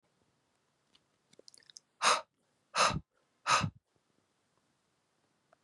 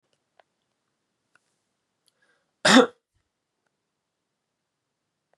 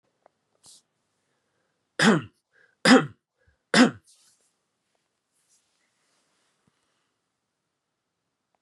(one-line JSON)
{"exhalation_length": "5.6 s", "exhalation_amplitude": 8322, "exhalation_signal_mean_std_ratio": 0.26, "cough_length": "5.4 s", "cough_amplitude": 24689, "cough_signal_mean_std_ratio": 0.15, "three_cough_length": "8.6 s", "three_cough_amplitude": 21559, "three_cough_signal_mean_std_ratio": 0.2, "survey_phase": "beta (2021-08-13 to 2022-03-07)", "age": "18-44", "gender": "Male", "wearing_mask": "No", "symptom_runny_or_blocked_nose": true, "symptom_fatigue": true, "symptom_headache": true, "smoker_status": "Ex-smoker", "respiratory_condition_asthma": false, "respiratory_condition_other": false, "recruitment_source": "Test and Trace", "submission_delay": "2 days", "covid_test_result": "Positive", "covid_test_method": "RT-qPCR"}